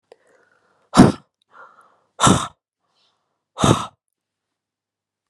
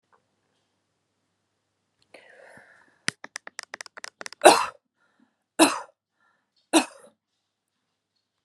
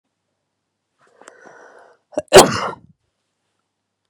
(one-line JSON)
{"exhalation_length": "5.3 s", "exhalation_amplitude": 32768, "exhalation_signal_mean_std_ratio": 0.25, "three_cough_length": "8.4 s", "three_cough_amplitude": 32716, "three_cough_signal_mean_std_ratio": 0.18, "cough_length": "4.1 s", "cough_amplitude": 32768, "cough_signal_mean_std_ratio": 0.2, "survey_phase": "beta (2021-08-13 to 2022-03-07)", "age": "18-44", "gender": "Female", "wearing_mask": "No", "symptom_none": true, "symptom_onset": "12 days", "smoker_status": "Never smoked", "respiratory_condition_asthma": false, "respiratory_condition_other": false, "recruitment_source": "REACT", "submission_delay": "2 days", "covid_test_result": "Negative", "covid_test_method": "RT-qPCR"}